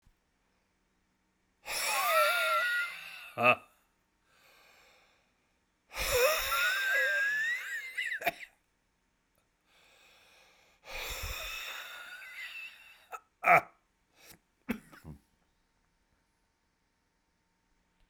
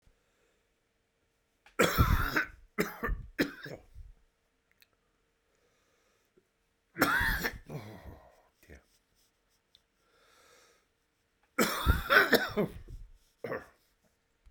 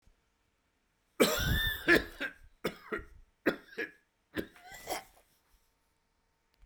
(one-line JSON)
{"exhalation_length": "18.1 s", "exhalation_amplitude": 11957, "exhalation_signal_mean_std_ratio": 0.42, "three_cough_length": "14.5 s", "three_cough_amplitude": 12632, "three_cough_signal_mean_std_ratio": 0.34, "cough_length": "6.7 s", "cough_amplitude": 8869, "cough_signal_mean_std_ratio": 0.34, "survey_phase": "beta (2021-08-13 to 2022-03-07)", "age": "45-64", "gender": "Male", "wearing_mask": "No", "symptom_cough_any": true, "symptom_runny_or_blocked_nose": true, "symptom_sore_throat": true, "symptom_diarrhoea": true, "symptom_fatigue": true, "symptom_fever_high_temperature": true, "symptom_headache": true, "symptom_change_to_sense_of_smell_or_taste": true, "symptom_onset": "3 days", "smoker_status": "Never smoked", "respiratory_condition_asthma": false, "respiratory_condition_other": false, "recruitment_source": "Test and Trace", "submission_delay": "2 days", "covid_test_result": "Positive", "covid_test_method": "RT-qPCR", "covid_ct_value": 18.6, "covid_ct_gene": "ORF1ab gene"}